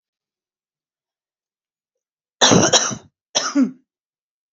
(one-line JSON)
{"cough_length": "4.5 s", "cough_amplitude": 31421, "cough_signal_mean_std_ratio": 0.32, "survey_phase": "beta (2021-08-13 to 2022-03-07)", "age": "45-64", "gender": "Female", "wearing_mask": "No", "symptom_none": true, "smoker_status": "Current smoker (e-cigarettes or vapes only)", "respiratory_condition_asthma": false, "respiratory_condition_other": false, "recruitment_source": "REACT", "submission_delay": "3 days", "covid_test_result": "Negative", "covid_test_method": "RT-qPCR", "influenza_a_test_result": "Negative", "influenza_b_test_result": "Negative"}